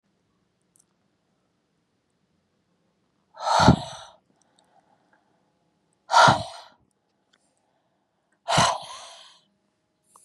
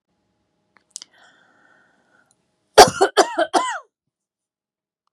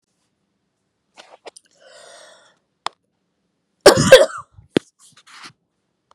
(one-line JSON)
{"exhalation_length": "10.2 s", "exhalation_amplitude": 27867, "exhalation_signal_mean_std_ratio": 0.24, "three_cough_length": "5.1 s", "three_cough_amplitude": 32768, "three_cough_signal_mean_std_ratio": 0.22, "cough_length": "6.1 s", "cough_amplitude": 32768, "cough_signal_mean_std_ratio": 0.2, "survey_phase": "beta (2021-08-13 to 2022-03-07)", "age": "45-64", "gender": "Female", "wearing_mask": "No", "symptom_none": true, "smoker_status": "Never smoked", "respiratory_condition_asthma": false, "respiratory_condition_other": false, "recruitment_source": "REACT", "submission_delay": "4 days", "covid_test_result": "Negative", "covid_test_method": "RT-qPCR"}